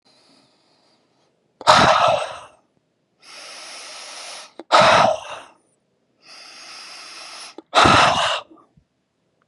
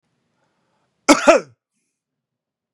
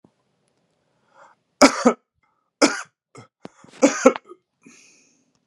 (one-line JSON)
{"exhalation_length": "9.5 s", "exhalation_amplitude": 32702, "exhalation_signal_mean_std_ratio": 0.38, "cough_length": "2.7 s", "cough_amplitude": 32767, "cough_signal_mean_std_ratio": 0.23, "three_cough_length": "5.5 s", "three_cough_amplitude": 32767, "three_cough_signal_mean_std_ratio": 0.24, "survey_phase": "beta (2021-08-13 to 2022-03-07)", "age": "18-44", "gender": "Male", "wearing_mask": "No", "symptom_none": true, "smoker_status": "Never smoked", "respiratory_condition_asthma": false, "respiratory_condition_other": false, "recruitment_source": "REACT", "submission_delay": "1 day", "covid_test_result": "Negative", "covid_test_method": "RT-qPCR", "influenza_a_test_result": "Unknown/Void", "influenza_b_test_result": "Unknown/Void"}